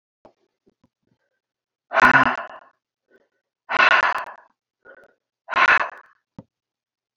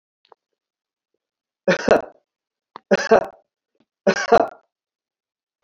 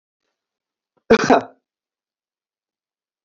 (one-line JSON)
{"exhalation_length": "7.2 s", "exhalation_amplitude": 30628, "exhalation_signal_mean_std_ratio": 0.32, "three_cough_length": "5.6 s", "three_cough_amplitude": 28663, "three_cough_signal_mean_std_ratio": 0.27, "cough_length": "3.2 s", "cough_amplitude": 27385, "cough_signal_mean_std_ratio": 0.21, "survey_phase": "beta (2021-08-13 to 2022-03-07)", "age": "45-64", "gender": "Male", "wearing_mask": "No", "symptom_none": true, "smoker_status": "Never smoked", "respiratory_condition_asthma": false, "respiratory_condition_other": false, "recruitment_source": "REACT", "submission_delay": "3 days", "covid_test_result": "Negative", "covid_test_method": "RT-qPCR", "influenza_a_test_result": "Negative", "influenza_b_test_result": "Negative"}